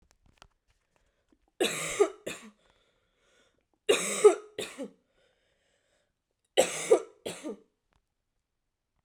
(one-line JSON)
{"three_cough_length": "9.0 s", "three_cough_amplitude": 13220, "three_cough_signal_mean_std_ratio": 0.27, "survey_phase": "beta (2021-08-13 to 2022-03-07)", "age": "18-44", "gender": "Female", "wearing_mask": "No", "symptom_new_continuous_cough": true, "symptom_sore_throat": true, "symptom_fever_high_temperature": true, "smoker_status": "Never smoked", "respiratory_condition_asthma": false, "respiratory_condition_other": false, "recruitment_source": "Test and Trace", "submission_delay": "2 days", "covid_test_result": "Positive", "covid_test_method": "ePCR"}